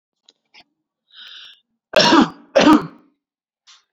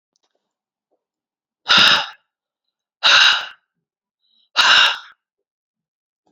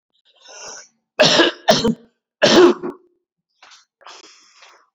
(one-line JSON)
{"cough_length": "3.9 s", "cough_amplitude": 29779, "cough_signal_mean_std_ratio": 0.32, "exhalation_length": "6.3 s", "exhalation_amplitude": 31618, "exhalation_signal_mean_std_ratio": 0.34, "three_cough_length": "4.9 s", "three_cough_amplitude": 29520, "three_cough_signal_mean_std_ratio": 0.37, "survey_phase": "alpha (2021-03-01 to 2021-08-12)", "age": "18-44", "gender": "Male", "wearing_mask": "No", "symptom_cough_any": true, "symptom_fatigue": true, "symptom_headache": true, "symptom_onset": "4 days", "smoker_status": "Never smoked", "respiratory_condition_asthma": false, "respiratory_condition_other": false, "recruitment_source": "Test and Trace", "submission_delay": "2 days", "covid_test_result": "Positive", "covid_test_method": "RT-qPCR", "covid_ct_value": 13.8, "covid_ct_gene": "N gene", "covid_ct_mean": 14.3, "covid_viral_load": "20000000 copies/ml", "covid_viral_load_category": "High viral load (>1M copies/ml)"}